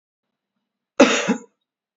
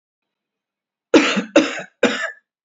{"cough_length": "2.0 s", "cough_amplitude": 27254, "cough_signal_mean_std_ratio": 0.29, "three_cough_length": "2.6 s", "three_cough_amplitude": 28472, "three_cough_signal_mean_std_ratio": 0.38, "survey_phase": "beta (2021-08-13 to 2022-03-07)", "age": "18-44", "gender": "Male", "wearing_mask": "No", "symptom_none": true, "smoker_status": "Never smoked", "respiratory_condition_asthma": false, "respiratory_condition_other": false, "recruitment_source": "REACT", "submission_delay": "3 days", "covid_test_result": "Negative", "covid_test_method": "RT-qPCR", "influenza_a_test_result": "Negative", "influenza_b_test_result": "Negative"}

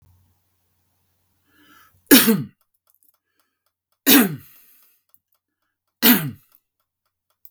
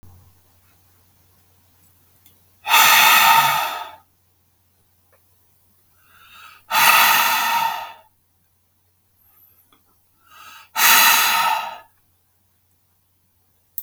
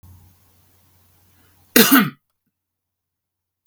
{"three_cough_length": "7.5 s", "three_cough_amplitude": 32768, "three_cough_signal_mean_std_ratio": 0.25, "exhalation_length": "13.8 s", "exhalation_amplitude": 32766, "exhalation_signal_mean_std_ratio": 0.39, "cough_length": "3.7 s", "cough_amplitude": 32768, "cough_signal_mean_std_ratio": 0.24, "survey_phase": "beta (2021-08-13 to 2022-03-07)", "age": "45-64", "gender": "Male", "wearing_mask": "No", "symptom_none": true, "smoker_status": "Never smoked", "respiratory_condition_asthma": false, "respiratory_condition_other": false, "recruitment_source": "REACT", "submission_delay": "1 day", "covid_test_result": "Negative", "covid_test_method": "RT-qPCR", "influenza_a_test_result": "Unknown/Void", "influenza_b_test_result": "Unknown/Void"}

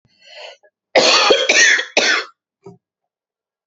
{"cough_length": "3.7 s", "cough_amplitude": 32767, "cough_signal_mean_std_ratio": 0.48, "survey_phase": "beta (2021-08-13 to 2022-03-07)", "age": "45-64", "gender": "Female", "wearing_mask": "No", "symptom_sore_throat": true, "smoker_status": "Never smoked", "respiratory_condition_asthma": false, "respiratory_condition_other": true, "recruitment_source": "Test and Trace", "submission_delay": "2 days", "covid_test_result": "Negative", "covid_test_method": "RT-qPCR"}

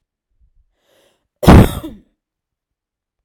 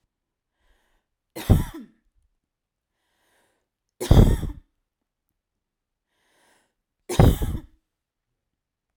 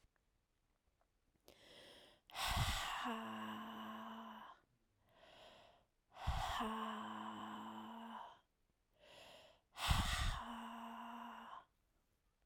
{"cough_length": "3.2 s", "cough_amplitude": 32768, "cough_signal_mean_std_ratio": 0.24, "three_cough_length": "9.0 s", "three_cough_amplitude": 28332, "three_cough_signal_mean_std_ratio": 0.24, "exhalation_length": "12.5 s", "exhalation_amplitude": 2707, "exhalation_signal_mean_std_ratio": 0.55, "survey_phase": "beta (2021-08-13 to 2022-03-07)", "age": "18-44", "gender": "Female", "wearing_mask": "No", "symptom_fatigue": true, "symptom_onset": "12 days", "smoker_status": "Never smoked", "respiratory_condition_asthma": true, "respiratory_condition_other": false, "recruitment_source": "REACT", "submission_delay": "8 days", "covid_test_result": "Negative", "covid_test_method": "RT-qPCR"}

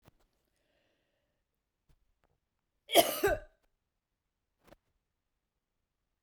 {"cough_length": "6.2 s", "cough_amplitude": 11320, "cough_signal_mean_std_ratio": 0.18, "survey_phase": "beta (2021-08-13 to 2022-03-07)", "age": "18-44", "gender": "Female", "wearing_mask": "No", "symptom_none": true, "smoker_status": "Ex-smoker", "respiratory_condition_asthma": false, "respiratory_condition_other": false, "recruitment_source": "REACT", "submission_delay": "0 days", "covid_test_result": "Negative", "covid_test_method": "RT-qPCR"}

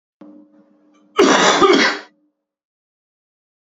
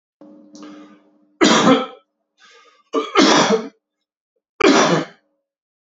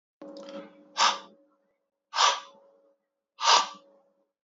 {"cough_length": "3.7 s", "cough_amplitude": 28647, "cough_signal_mean_std_ratio": 0.39, "three_cough_length": "6.0 s", "three_cough_amplitude": 29699, "three_cough_signal_mean_std_ratio": 0.42, "exhalation_length": "4.4 s", "exhalation_amplitude": 15937, "exhalation_signal_mean_std_ratio": 0.33, "survey_phase": "beta (2021-08-13 to 2022-03-07)", "age": "18-44", "gender": "Male", "wearing_mask": "No", "symptom_runny_or_blocked_nose": true, "symptom_sore_throat": true, "symptom_fatigue": true, "symptom_headache": true, "symptom_onset": "5 days", "smoker_status": "Ex-smoker", "respiratory_condition_asthma": false, "respiratory_condition_other": false, "recruitment_source": "Test and Trace", "submission_delay": "1 day", "covid_test_result": "Positive", "covid_test_method": "RT-qPCR", "covid_ct_value": 15.2, "covid_ct_gene": "ORF1ab gene", "covid_ct_mean": 15.5, "covid_viral_load": "8500000 copies/ml", "covid_viral_load_category": "High viral load (>1M copies/ml)"}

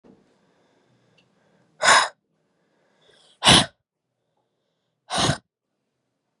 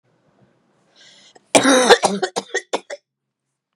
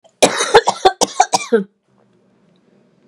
{"exhalation_length": "6.4 s", "exhalation_amplitude": 29308, "exhalation_signal_mean_std_ratio": 0.25, "three_cough_length": "3.8 s", "three_cough_amplitude": 32768, "three_cough_signal_mean_std_ratio": 0.33, "cough_length": "3.1 s", "cough_amplitude": 32768, "cough_signal_mean_std_ratio": 0.37, "survey_phase": "beta (2021-08-13 to 2022-03-07)", "age": "18-44", "gender": "Female", "wearing_mask": "Yes", "symptom_runny_or_blocked_nose": true, "symptom_other": true, "smoker_status": "Never smoked", "respiratory_condition_asthma": false, "respiratory_condition_other": false, "recruitment_source": "Test and Trace", "submission_delay": "2 days", "covid_test_result": "Positive", "covid_test_method": "ePCR"}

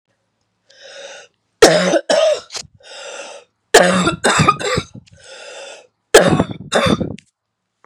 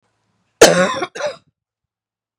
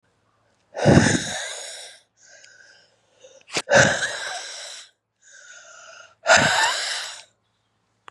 {"three_cough_length": "7.9 s", "three_cough_amplitude": 32768, "three_cough_signal_mean_std_ratio": 0.45, "cough_length": "2.4 s", "cough_amplitude": 32768, "cough_signal_mean_std_ratio": 0.31, "exhalation_length": "8.1 s", "exhalation_amplitude": 30515, "exhalation_signal_mean_std_ratio": 0.4, "survey_phase": "beta (2021-08-13 to 2022-03-07)", "age": "18-44", "gender": "Female", "wearing_mask": "No", "symptom_cough_any": true, "symptom_runny_or_blocked_nose": true, "symptom_sore_throat": true, "symptom_fatigue": true, "symptom_headache": true, "symptom_onset": "3 days", "smoker_status": "Never smoked", "respiratory_condition_asthma": true, "respiratory_condition_other": false, "recruitment_source": "Test and Trace", "submission_delay": "1 day", "covid_test_result": "Positive", "covid_test_method": "RT-qPCR", "covid_ct_value": 29.1, "covid_ct_gene": "ORF1ab gene"}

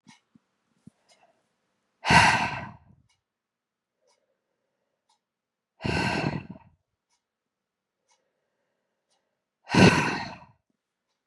{"exhalation_length": "11.3 s", "exhalation_amplitude": 23486, "exhalation_signal_mean_std_ratio": 0.26, "survey_phase": "beta (2021-08-13 to 2022-03-07)", "age": "45-64", "gender": "Female", "wearing_mask": "No", "symptom_cough_any": true, "symptom_runny_or_blocked_nose": true, "symptom_shortness_of_breath": true, "symptom_sore_throat": true, "symptom_fatigue": true, "symptom_fever_high_temperature": true, "symptom_headache": true, "symptom_other": true, "symptom_onset": "4 days", "smoker_status": "Never smoked", "respiratory_condition_asthma": false, "respiratory_condition_other": false, "recruitment_source": "Test and Trace", "submission_delay": "2 days", "covid_test_result": "Positive", "covid_test_method": "RT-qPCR", "covid_ct_value": 18.4, "covid_ct_gene": "ORF1ab gene"}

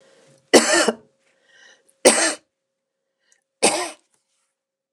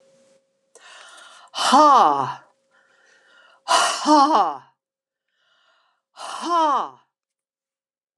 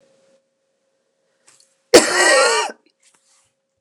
{"three_cough_length": "4.9 s", "three_cough_amplitude": 29204, "three_cough_signal_mean_std_ratio": 0.31, "exhalation_length": "8.2 s", "exhalation_amplitude": 26891, "exhalation_signal_mean_std_ratio": 0.4, "cough_length": "3.8 s", "cough_amplitude": 29204, "cough_signal_mean_std_ratio": 0.33, "survey_phase": "beta (2021-08-13 to 2022-03-07)", "age": "65+", "gender": "Female", "wearing_mask": "No", "symptom_runny_or_blocked_nose": true, "symptom_onset": "4 days", "smoker_status": "Ex-smoker", "respiratory_condition_asthma": false, "respiratory_condition_other": false, "recruitment_source": "Test and Trace", "submission_delay": "1 day", "covid_test_result": "Positive", "covid_test_method": "RT-qPCR"}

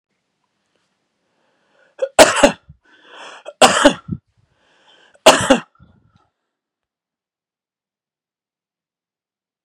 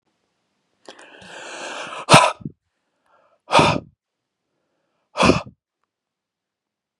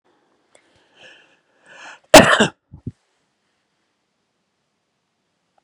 {"three_cough_length": "9.6 s", "three_cough_amplitude": 32768, "three_cough_signal_mean_std_ratio": 0.23, "exhalation_length": "7.0 s", "exhalation_amplitude": 32768, "exhalation_signal_mean_std_ratio": 0.27, "cough_length": "5.6 s", "cough_amplitude": 32768, "cough_signal_mean_std_ratio": 0.18, "survey_phase": "beta (2021-08-13 to 2022-03-07)", "age": "18-44", "gender": "Female", "wearing_mask": "No", "symptom_none": true, "smoker_status": "Ex-smoker", "respiratory_condition_asthma": true, "respiratory_condition_other": false, "recruitment_source": "REACT", "submission_delay": "1 day", "covid_test_result": "Negative", "covid_test_method": "RT-qPCR", "influenza_a_test_result": "Negative", "influenza_b_test_result": "Negative"}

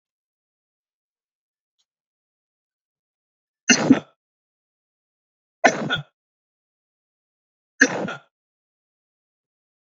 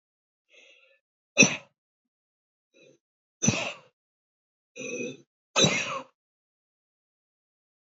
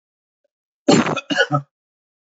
{"three_cough_length": "9.9 s", "three_cough_amplitude": 29093, "three_cough_signal_mean_std_ratio": 0.19, "exhalation_length": "7.9 s", "exhalation_amplitude": 20961, "exhalation_signal_mean_std_ratio": 0.25, "cough_length": "2.4 s", "cough_amplitude": 27071, "cough_signal_mean_std_ratio": 0.36, "survey_phase": "beta (2021-08-13 to 2022-03-07)", "age": "65+", "gender": "Male", "wearing_mask": "No", "symptom_none": true, "symptom_onset": "8 days", "smoker_status": "Ex-smoker", "respiratory_condition_asthma": false, "respiratory_condition_other": false, "recruitment_source": "REACT", "submission_delay": "8 days", "covid_test_result": "Negative", "covid_test_method": "RT-qPCR", "influenza_a_test_result": "Negative", "influenza_b_test_result": "Negative"}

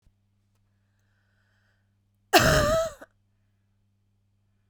{"cough_length": "4.7 s", "cough_amplitude": 20135, "cough_signal_mean_std_ratio": 0.27, "survey_phase": "beta (2021-08-13 to 2022-03-07)", "age": "18-44", "gender": "Female", "wearing_mask": "No", "symptom_cough_any": true, "symptom_runny_or_blocked_nose": true, "symptom_shortness_of_breath": true, "symptom_diarrhoea": true, "symptom_other": true, "smoker_status": "Never smoked", "respiratory_condition_asthma": true, "respiratory_condition_other": false, "recruitment_source": "Test and Trace", "submission_delay": "1 day", "covid_test_result": "Positive", "covid_test_method": "LFT"}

